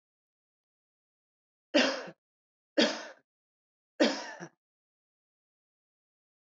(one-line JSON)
{"three_cough_length": "6.6 s", "three_cough_amplitude": 8584, "three_cough_signal_mean_std_ratio": 0.24, "survey_phase": "beta (2021-08-13 to 2022-03-07)", "age": "45-64", "gender": "Female", "wearing_mask": "No", "symptom_none": true, "smoker_status": "Never smoked", "respiratory_condition_asthma": false, "respiratory_condition_other": false, "recruitment_source": "REACT", "submission_delay": "2 days", "covid_test_result": "Negative", "covid_test_method": "RT-qPCR", "influenza_a_test_result": "Negative", "influenza_b_test_result": "Negative"}